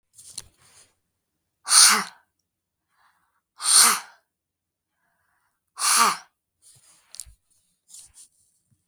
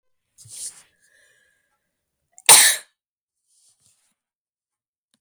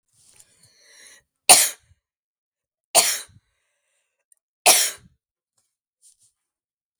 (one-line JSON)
{"exhalation_length": "8.9 s", "exhalation_amplitude": 32768, "exhalation_signal_mean_std_ratio": 0.27, "cough_length": "5.2 s", "cough_amplitude": 32768, "cough_signal_mean_std_ratio": 0.19, "three_cough_length": "7.0 s", "three_cough_amplitude": 32768, "three_cough_signal_mean_std_ratio": 0.22, "survey_phase": "beta (2021-08-13 to 2022-03-07)", "age": "18-44", "gender": "Female", "wearing_mask": "No", "symptom_none": true, "smoker_status": "Never smoked", "respiratory_condition_asthma": false, "respiratory_condition_other": false, "recruitment_source": "REACT", "submission_delay": "6 days", "covid_test_result": "Negative", "covid_test_method": "RT-qPCR", "influenza_a_test_result": "Negative", "influenza_b_test_result": "Negative"}